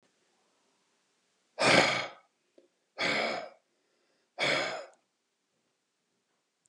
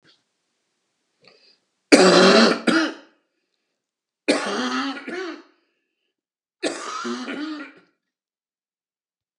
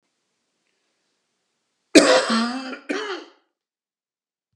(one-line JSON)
{"exhalation_length": "6.7 s", "exhalation_amplitude": 13505, "exhalation_signal_mean_std_ratio": 0.34, "three_cough_length": "9.4 s", "three_cough_amplitude": 32766, "three_cough_signal_mean_std_ratio": 0.35, "cough_length": "4.6 s", "cough_amplitude": 32768, "cough_signal_mean_std_ratio": 0.3, "survey_phase": "beta (2021-08-13 to 2022-03-07)", "age": "45-64", "gender": "Male", "wearing_mask": "No", "symptom_none": true, "smoker_status": "Never smoked", "respiratory_condition_asthma": false, "respiratory_condition_other": false, "recruitment_source": "REACT", "submission_delay": "2 days", "covid_test_result": "Negative", "covid_test_method": "RT-qPCR"}